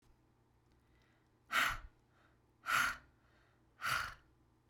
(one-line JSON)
{"exhalation_length": "4.7 s", "exhalation_amplitude": 3605, "exhalation_signal_mean_std_ratio": 0.36, "survey_phase": "beta (2021-08-13 to 2022-03-07)", "age": "18-44", "gender": "Female", "wearing_mask": "Yes", "symptom_fatigue": true, "symptom_onset": "12 days", "smoker_status": "Ex-smoker", "respiratory_condition_asthma": true, "respiratory_condition_other": false, "recruitment_source": "REACT", "submission_delay": "3 days", "covid_test_result": "Negative", "covid_test_method": "RT-qPCR"}